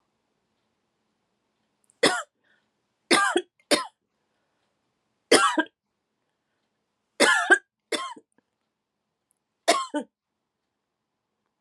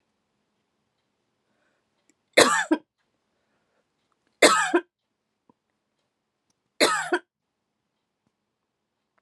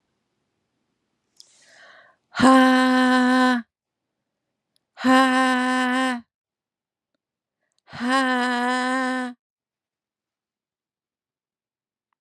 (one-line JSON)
{"cough_length": "11.6 s", "cough_amplitude": 22634, "cough_signal_mean_std_ratio": 0.27, "three_cough_length": "9.2 s", "three_cough_amplitude": 31245, "three_cough_signal_mean_std_ratio": 0.24, "exhalation_length": "12.2 s", "exhalation_amplitude": 25352, "exhalation_signal_mean_std_ratio": 0.47, "survey_phase": "beta (2021-08-13 to 2022-03-07)", "age": "45-64", "gender": "Female", "wearing_mask": "No", "symptom_headache": true, "symptom_onset": "12 days", "smoker_status": "Never smoked", "respiratory_condition_asthma": false, "respiratory_condition_other": false, "recruitment_source": "REACT", "submission_delay": "2 days", "covid_test_result": "Negative", "covid_test_method": "RT-qPCR", "influenza_a_test_result": "Negative", "influenza_b_test_result": "Negative"}